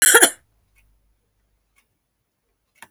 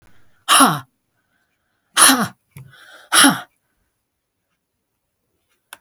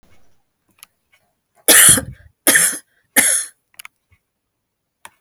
cough_length: 2.9 s
cough_amplitude: 32768
cough_signal_mean_std_ratio: 0.23
exhalation_length: 5.8 s
exhalation_amplitude: 32768
exhalation_signal_mean_std_ratio: 0.3
three_cough_length: 5.2 s
three_cough_amplitude: 32768
three_cough_signal_mean_std_ratio: 0.32
survey_phase: beta (2021-08-13 to 2022-03-07)
age: 65+
gender: Female
wearing_mask: 'No'
symptom_none: true
symptom_onset: 6 days
smoker_status: Ex-smoker
respiratory_condition_asthma: false
respiratory_condition_other: false
recruitment_source: REACT
submission_delay: 1 day
covid_test_result: Negative
covid_test_method: RT-qPCR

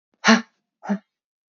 exhalation_length: 1.5 s
exhalation_amplitude: 30009
exhalation_signal_mean_std_ratio: 0.3
survey_phase: beta (2021-08-13 to 2022-03-07)
age: 18-44
gender: Female
wearing_mask: 'No'
symptom_cough_any: true
symptom_runny_or_blocked_nose: true
symptom_change_to_sense_of_smell_or_taste: true
symptom_onset: 5 days
smoker_status: Never smoked
respiratory_condition_asthma: false
respiratory_condition_other: false
recruitment_source: Test and Trace
submission_delay: 2 days
covid_test_result: Positive
covid_test_method: ePCR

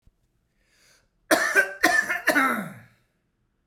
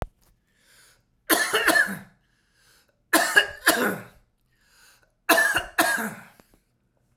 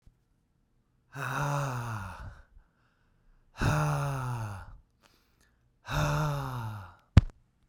cough_length: 3.7 s
cough_amplitude: 20560
cough_signal_mean_std_ratio: 0.44
three_cough_length: 7.2 s
three_cough_amplitude: 23489
three_cough_signal_mean_std_ratio: 0.41
exhalation_length: 7.7 s
exhalation_amplitude: 21419
exhalation_signal_mean_std_ratio: 0.45
survey_phase: beta (2021-08-13 to 2022-03-07)
age: 45-64
gender: Male
wearing_mask: 'No'
symptom_cough_any: true
symptom_shortness_of_breath: true
symptom_sore_throat: true
symptom_change_to_sense_of_smell_or_taste: true
smoker_status: Never smoked
respiratory_condition_asthma: false
respiratory_condition_other: false
recruitment_source: REACT
submission_delay: 2 days
covid_test_result: Positive
covid_test_method: RT-qPCR
covid_ct_value: 29.0
covid_ct_gene: E gene
influenza_a_test_result: Negative
influenza_b_test_result: Negative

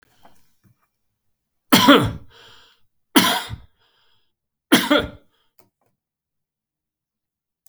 three_cough_length: 7.7 s
three_cough_amplitude: 32768
three_cough_signal_mean_std_ratio: 0.27
survey_phase: beta (2021-08-13 to 2022-03-07)
age: 65+
gender: Male
wearing_mask: 'No'
symptom_none: true
smoker_status: Never smoked
respiratory_condition_asthma: false
respiratory_condition_other: false
recruitment_source: REACT
submission_delay: 3 days
covid_test_result: Negative
covid_test_method: RT-qPCR
influenza_a_test_result: Negative
influenza_b_test_result: Negative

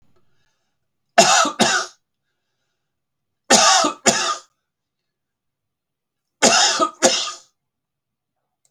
three_cough_length: 8.7 s
three_cough_amplitude: 32768
three_cough_signal_mean_std_ratio: 0.37
survey_phase: beta (2021-08-13 to 2022-03-07)
age: 45-64
gender: Male
wearing_mask: 'No'
symptom_cough_any: true
smoker_status: Never smoked
respiratory_condition_asthma: false
respiratory_condition_other: false
recruitment_source: REACT
submission_delay: 4 days
covid_test_result: Negative
covid_test_method: RT-qPCR
influenza_a_test_result: Negative
influenza_b_test_result: Negative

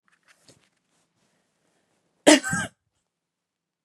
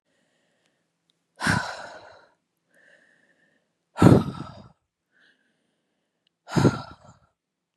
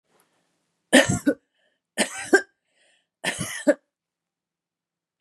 cough_length: 3.8 s
cough_amplitude: 31223
cough_signal_mean_std_ratio: 0.18
exhalation_length: 7.8 s
exhalation_amplitude: 32768
exhalation_signal_mean_std_ratio: 0.23
three_cough_length: 5.2 s
three_cough_amplitude: 28286
three_cough_signal_mean_std_ratio: 0.28
survey_phase: beta (2021-08-13 to 2022-03-07)
age: 45-64
gender: Female
wearing_mask: 'No'
symptom_none: true
smoker_status: Ex-smoker
recruitment_source: REACT
submission_delay: 2 days
covid_test_result: Negative
covid_test_method: RT-qPCR
influenza_a_test_result: Unknown/Void
influenza_b_test_result: Unknown/Void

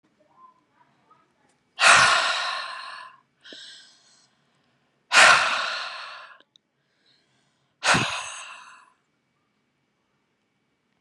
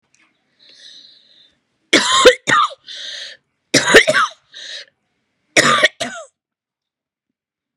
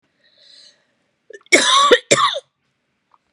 exhalation_length: 11.0 s
exhalation_amplitude: 28520
exhalation_signal_mean_std_ratio: 0.32
three_cough_length: 7.8 s
three_cough_amplitude: 32768
three_cough_signal_mean_std_ratio: 0.36
cough_length: 3.3 s
cough_amplitude: 32768
cough_signal_mean_std_ratio: 0.37
survey_phase: beta (2021-08-13 to 2022-03-07)
age: 45-64
gender: Female
wearing_mask: 'No'
symptom_fatigue: true
symptom_onset: 13 days
smoker_status: Never smoked
respiratory_condition_asthma: false
respiratory_condition_other: false
recruitment_source: REACT
submission_delay: 1 day
covid_test_result: Negative
covid_test_method: RT-qPCR
covid_ct_value: 44.0
covid_ct_gene: N gene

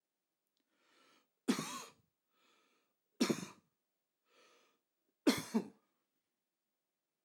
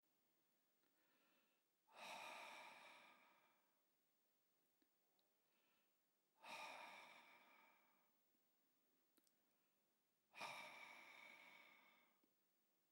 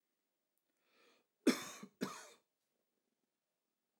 three_cough_length: 7.2 s
three_cough_amplitude: 4176
three_cough_signal_mean_std_ratio: 0.23
exhalation_length: 12.9 s
exhalation_amplitude: 279
exhalation_signal_mean_std_ratio: 0.49
cough_length: 4.0 s
cough_amplitude: 4341
cough_signal_mean_std_ratio: 0.19
survey_phase: alpha (2021-03-01 to 2021-08-12)
age: 45-64
gender: Male
wearing_mask: 'No'
symptom_fatigue: true
smoker_status: Never smoked
respiratory_condition_asthma: false
respiratory_condition_other: false
recruitment_source: REACT
submission_delay: 2 days
covid_test_result: Negative
covid_test_method: RT-qPCR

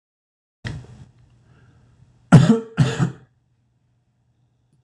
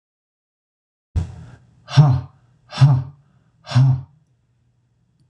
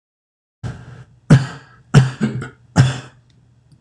cough_length: 4.8 s
cough_amplitude: 26028
cough_signal_mean_std_ratio: 0.26
exhalation_length: 5.3 s
exhalation_amplitude: 26028
exhalation_signal_mean_std_ratio: 0.35
three_cough_length: 3.8 s
three_cough_amplitude: 26028
three_cough_signal_mean_std_ratio: 0.35
survey_phase: beta (2021-08-13 to 2022-03-07)
age: 45-64
gender: Male
wearing_mask: 'No'
symptom_none: true
smoker_status: Never smoked
respiratory_condition_asthma: false
respiratory_condition_other: false
recruitment_source: REACT
submission_delay: 1 day
covid_test_result: Negative
covid_test_method: RT-qPCR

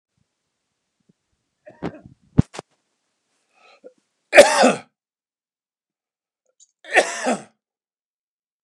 three_cough_length: 8.6 s
three_cough_amplitude: 32768
three_cough_signal_mean_std_ratio: 0.21
survey_phase: beta (2021-08-13 to 2022-03-07)
age: 45-64
gender: Male
wearing_mask: 'No'
symptom_none: true
smoker_status: Never smoked
respiratory_condition_asthma: false
respiratory_condition_other: false
recruitment_source: REACT
submission_delay: 4 days
covid_test_result: Negative
covid_test_method: RT-qPCR
influenza_a_test_result: Unknown/Void
influenza_b_test_result: Unknown/Void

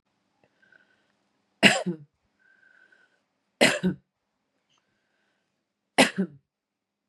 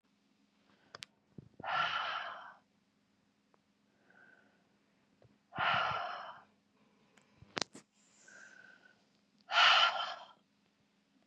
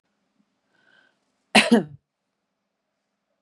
three_cough_length: 7.1 s
three_cough_amplitude: 27210
three_cough_signal_mean_std_ratio: 0.23
exhalation_length: 11.3 s
exhalation_amplitude: 10673
exhalation_signal_mean_std_ratio: 0.32
cough_length: 3.4 s
cough_amplitude: 28316
cough_signal_mean_std_ratio: 0.2
survey_phase: beta (2021-08-13 to 2022-03-07)
age: 45-64
gender: Female
wearing_mask: 'No'
symptom_cough_any: true
symptom_runny_or_blocked_nose: true
symptom_fatigue: true
symptom_headache: true
symptom_onset: 5 days
smoker_status: Current smoker (11 or more cigarettes per day)
respiratory_condition_asthma: false
respiratory_condition_other: false
recruitment_source: Test and Trace
submission_delay: 2 days
covid_test_result: Positive
covid_test_method: RT-qPCR
covid_ct_value: 18.3
covid_ct_gene: N gene
covid_ct_mean: 18.9
covid_viral_load: 640000 copies/ml
covid_viral_load_category: Low viral load (10K-1M copies/ml)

